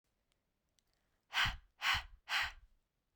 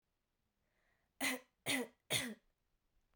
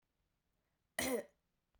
{"exhalation_length": "3.2 s", "exhalation_amplitude": 2877, "exhalation_signal_mean_std_ratio": 0.37, "three_cough_length": "3.2 s", "three_cough_amplitude": 2707, "three_cough_signal_mean_std_ratio": 0.35, "cough_length": "1.8 s", "cough_amplitude": 2412, "cough_signal_mean_std_ratio": 0.31, "survey_phase": "beta (2021-08-13 to 2022-03-07)", "age": "18-44", "gender": "Female", "wearing_mask": "No", "symptom_cough_any": true, "symptom_runny_or_blocked_nose": true, "symptom_sore_throat": true, "symptom_fever_high_temperature": true, "symptom_headache": true, "symptom_onset": "3 days", "smoker_status": "Never smoked", "respiratory_condition_asthma": false, "respiratory_condition_other": false, "recruitment_source": "Test and Trace", "submission_delay": "1 day", "covid_test_result": "Positive", "covid_test_method": "RT-qPCR", "covid_ct_value": 11.3, "covid_ct_gene": "S gene"}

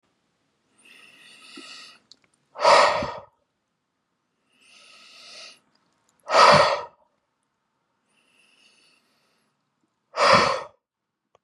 {"exhalation_length": "11.4 s", "exhalation_amplitude": 27461, "exhalation_signal_mean_std_ratio": 0.28, "survey_phase": "beta (2021-08-13 to 2022-03-07)", "age": "45-64", "gender": "Male", "wearing_mask": "No", "symptom_none": true, "smoker_status": "Never smoked", "respiratory_condition_asthma": false, "respiratory_condition_other": false, "recruitment_source": "REACT", "submission_delay": "2 days", "covid_test_result": "Negative", "covid_test_method": "RT-qPCR", "influenza_a_test_result": "Unknown/Void", "influenza_b_test_result": "Unknown/Void"}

